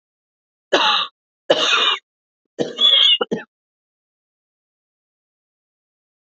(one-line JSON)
{"three_cough_length": "6.2 s", "three_cough_amplitude": 28611, "three_cough_signal_mean_std_ratio": 0.38, "survey_phase": "alpha (2021-03-01 to 2021-08-12)", "age": "45-64", "gender": "Female", "wearing_mask": "No", "symptom_cough_any": true, "symptom_fever_high_temperature": true, "symptom_headache": true, "symptom_onset": "3 days", "smoker_status": "Never smoked", "respiratory_condition_asthma": false, "respiratory_condition_other": false, "recruitment_source": "Test and Trace", "submission_delay": "1 day", "covid_test_result": "Positive", "covid_test_method": "RT-qPCR"}